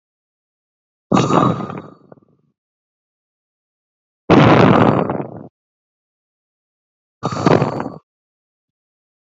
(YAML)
exhalation_length: 9.4 s
exhalation_amplitude: 31456
exhalation_signal_mean_std_ratio: 0.35
survey_phase: beta (2021-08-13 to 2022-03-07)
age: 45-64
gender: Female
wearing_mask: 'No'
symptom_cough_any: true
symptom_runny_or_blocked_nose: true
symptom_sore_throat: true
symptom_diarrhoea: true
symptom_fever_high_temperature: true
symptom_other: true
symptom_onset: 3 days
smoker_status: Never smoked
respiratory_condition_asthma: false
respiratory_condition_other: false
recruitment_source: Test and Trace
submission_delay: 1 day
covid_test_result: Positive
covid_test_method: RT-qPCR
covid_ct_value: 20.3
covid_ct_gene: ORF1ab gene
covid_ct_mean: 20.6
covid_viral_load: 180000 copies/ml
covid_viral_load_category: Low viral load (10K-1M copies/ml)